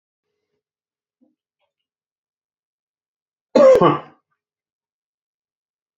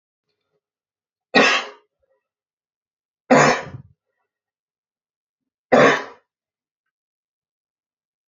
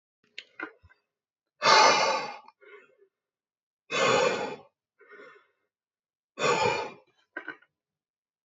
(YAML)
cough_length: 6.0 s
cough_amplitude: 27379
cough_signal_mean_std_ratio: 0.21
three_cough_length: 8.3 s
three_cough_amplitude: 29161
three_cough_signal_mean_std_ratio: 0.25
exhalation_length: 8.4 s
exhalation_amplitude: 17085
exhalation_signal_mean_std_ratio: 0.36
survey_phase: beta (2021-08-13 to 2022-03-07)
age: 45-64
gender: Male
wearing_mask: 'No'
symptom_none: true
smoker_status: Ex-smoker
respiratory_condition_asthma: false
respiratory_condition_other: false
recruitment_source: REACT
submission_delay: 3 days
covid_test_result: Negative
covid_test_method: RT-qPCR
influenza_a_test_result: Unknown/Void
influenza_b_test_result: Unknown/Void